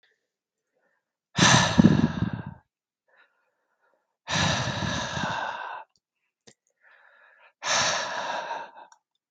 {
  "exhalation_length": "9.3 s",
  "exhalation_amplitude": 23255,
  "exhalation_signal_mean_std_ratio": 0.41,
  "survey_phase": "beta (2021-08-13 to 2022-03-07)",
  "age": "18-44",
  "gender": "Male",
  "wearing_mask": "No",
  "symptom_cough_any": true,
  "smoker_status": "Never smoked",
  "respiratory_condition_asthma": false,
  "respiratory_condition_other": false,
  "recruitment_source": "REACT",
  "submission_delay": "1 day",
  "covid_test_result": "Negative",
  "covid_test_method": "RT-qPCR"
}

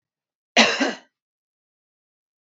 {
  "cough_length": "2.6 s",
  "cough_amplitude": 27423,
  "cough_signal_mean_std_ratio": 0.26,
  "survey_phase": "beta (2021-08-13 to 2022-03-07)",
  "age": "45-64",
  "gender": "Female",
  "wearing_mask": "No",
  "symptom_cough_any": true,
  "symptom_runny_or_blocked_nose": true,
  "symptom_sore_throat": true,
  "smoker_status": "Never smoked",
  "respiratory_condition_asthma": false,
  "respiratory_condition_other": false,
  "recruitment_source": "REACT",
  "submission_delay": "6 days",
  "covid_test_result": "Negative",
  "covid_test_method": "RT-qPCR",
  "influenza_a_test_result": "Negative",
  "influenza_b_test_result": "Negative"
}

